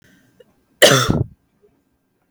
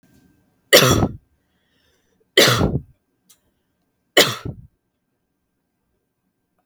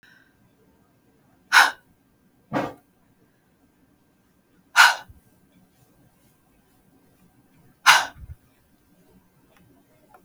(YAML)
cough_length: 2.3 s
cough_amplitude: 32768
cough_signal_mean_std_ratio: 0.31
three_cough_length: 6.7 s
three_cough_amplitude: 32768
three_cough_signal_mean_std_ratio: 0.28
exhalation_length: 10.2 s
exhalation_amplitude: 32768
exhalation_signal_mean_std_ratio: 0.2
survey_phase: beta (2021-08-13 to 2022-03-07)
age: 18-44
gender: Female
wearing_mask: 'No'
symptom_cough_any: true
symptom_runny_or_blocked_nose: true
symptom_onset: 12 days
smoker_status: Never smoked
respiratory_condition_asthma: false
respiratory_condition_other: false
recruitment_source: REACT
submission_delay: 1 day
covid_test_result: Negative
covid_test_method: RT-qPCR
covid_ct_value: 38.1
covid_ct_gene: N gene
influenza_a_test_result: Negative
influenza_b_test_result: Negative